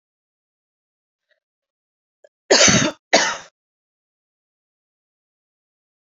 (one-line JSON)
{"cough_length": "6.1 s", "cough_amplitude": 32767, "cough_signal_mean_std_ratio": 0.24, "survey_phase": "beta (2021-08-13 to 2022-03-07)", "age": "18-44", "gender": "Female", "wearing_mask": "No", "symptom_runny_or_blocked_nose": true, "symptom_onset": "12 days", "smoker_status": "Never smoked", "respiratory_condition_asthma": false, "respiratory_condition_other": false, "recruitment_source": "REACT", "submission_delay": "1 day", "covid_test_result": "Negative", "covid_test_method": "RT-qPCR", "influenza_a_test_result": "Unknown/Void", "influenza_b_test_result": "Unknown/Void"}